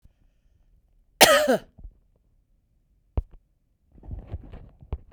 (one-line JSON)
{"cough_length": "5.1 s", "cough_amplitude": 32768, "cough_signal_mean_std_ratio": 0.26, "survey_phase": "beta (2021-08-13 to 2022-03-07)", "age": "45-64", "gender": "Female", "wearing_mask": "No", "symptom_headache": true, "smoker_status": "Ex-smoker", "respiratory_condition_asthma": false, "respiratory_condition_other": false, "recruitment_source": "REACT", "submission_delay": "1 day", "covid_test_result": "Negative", "covid_test_method": "RT-qPCR", "influenza_a_test_result": "Unknown/Void", "influenza_b_test_result": "Unknown/Void"}